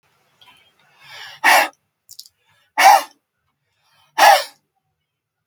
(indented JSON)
{
  "exhalation_length": "5.5 s",
  "exhalation_amplitude": 32768,
  "exhalation_signal_mean_std_ratio": 0.3,
  "survey_phase": "beta (2021-08-13 to 2022-03-07)",
  "age": "65+",
  "gender": "Male",
  "wearing_mask": "No",
  "symptom_cough_any": true,
  "symptom_runny_or_blocked_nose": true,
  "symptom_fatigue": true,
  "smoker_status": "Never smoked",
  "respiratory_condition_asthma": false,
  "respiratory_condition_other": false,
  "recruitment_source": "REACT",
  "submission_delay": "2 days",
  "covid_test_result": "Negative",
  "covid_test_method": "RT-qPCR",
  "influenza_a_test_result": "Negative",
  "influenza_b_test_result": "Negative"
}